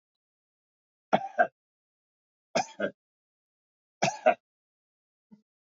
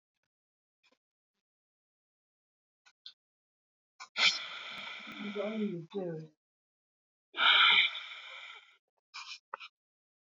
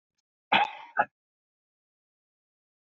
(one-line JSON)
{"three_cough_length": "5.6 s", "three_cough_amplitude": 11423, "three_cough_signal_mean_std_ratio": 0.23, "exhalation_length": "10.3 s", "exhalation_amplitude": 8299, "exhalation_signal_mean_std_ratio": 0.32, "cough_length": "3.0 s", "cough_amplitude": 11382, "cough_signal_mean_std_ratio": 0.22, "survey_phase": "beta (2021-08-13 to 2022-03-07)", "age": "65+", "gender": "Male", "wearing_mask": "No", "symptom_none": true, "smoker_status": "Ex-smoker", "respiratory_condition_asthma": false, "respiratory_condition_other": true, "recruitment_source": "REACT", "submission_delay": "3 days", "covid_test_result": "Negative", "covid_test_method": "RT-qPCR", "influenza_a_test_result": "Negative", "influenza_b_test_result": "Negative"}